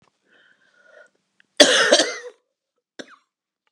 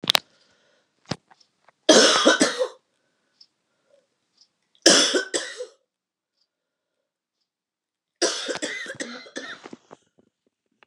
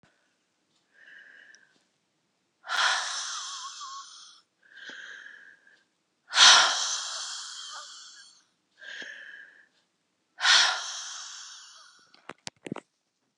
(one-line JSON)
{"cough_length": "3.7 s", "cough_amplitude": 32768, "cough_signal_mean_std_ratio": 0.28, "three_cough_length": "10.9 s", "three_cough_amplitude": 32768, "three_cough_signal_mean_std_ratio": 0.3, "exhalation_length": "13.4 s", "exhalation_amplitude": 22400, "exhalation_signal_mean_std_ratio": 0.32, "survey_phase": "beta (2021-08-13 to 2022-03-07)", "age": "45-64", "gender": "Female", "wearing_mask": "No", "symptom_cough_any": true, "symptom_runny_or_blocked_nose": true, "symptom_sore_throat": true, "symptom_fatigue": true, "symptom_fever_high_temperature": true, "symptom_headache": true, "symptom_onset": "2 days", "smoker_status": "Ex-smoker", "respiratory_condition_asthma": false, "respiratory_condition_other": false, "recruitment_source": "Test and Trace", "submission_delay": "1 day", "covid_test_result": "Positive", "covid_test_method": "RT-qPCR", "covid_ct_value": 26.2, "covid_ct_gene": "N gene"}